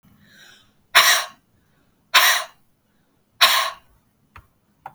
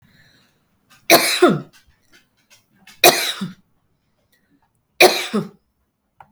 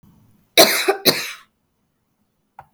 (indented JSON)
{
  "exhalation_length": "4.9 s",
  "exhalation_amplitude": 32768,
  "exhalation_signal_mean_std_ratio": 0.33,
  "three_cough_length": "6.3 s",
  "three_cough_amplitude": 32768,
  "three_cough_signal_mean_std_ratio": 0.3,
  "cough_length": "2.7 s",
  "cough_amplitude": 32768,
  "cough_signal_mean_std_ratio": 0.32,
  "survey_phase": "beta (2021-08-13 to 2022-03-07)",
  "age": "45-64",
  "gender": "Female",
  "wearing_mask": "No",
  "symptom_none": true,
  "smoker_status": "Never smoked",
  "respiratory_condition_asthma": true,
  "respiratory_condition_other": false,
  "recruitment_source": "REACT",
  "submission_delay": "2 days",
  "covid_test_result": "Negative",
  "covid_test_method": "RT-qPCR",
  "influenza_a_test_result": "Negative",
  "influenza_b_test_result": "Negative"
}